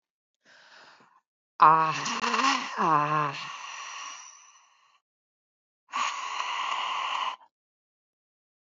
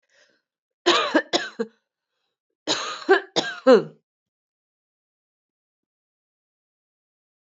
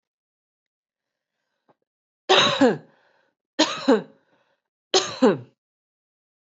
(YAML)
exhalation_length: 8.7 s
exhalation_amplitude: 18367
exhalation_signal_mean_std_ratio: 0.44
cough_length: 7.4 s
cough_amplitude: 20443
cough_signal_mean_std_ratio: 0.28
three_cough_length: 6.5 s
three_cough_amplitude: 19914
three_cough_signal_mean_std_ratio: 0.3
survey_phase: beta (2021-08-13 to 2022-03-07)
age: 45-64
gender: Female
wearing_mask: 'No'
symptom_cough_any: true
symptom_other: true
symptom_onset: 4 days
smoker_status: Never smoked
respiratory_condition_asthma: false
respiratory_condition_other: false
recruitment_source: Test and Trace
submission_delay: 1 day
covid_test_result: Positive
covid_test_method: RT-qPCR
covid_ct_value: 17.8
covid_ct_gene: ORF1ab gene
covid_ct_mean: 18.0
covid_viral_load: 1300000 copies/ml
covid_viral_load_category: High viral load (>1M copies/ml)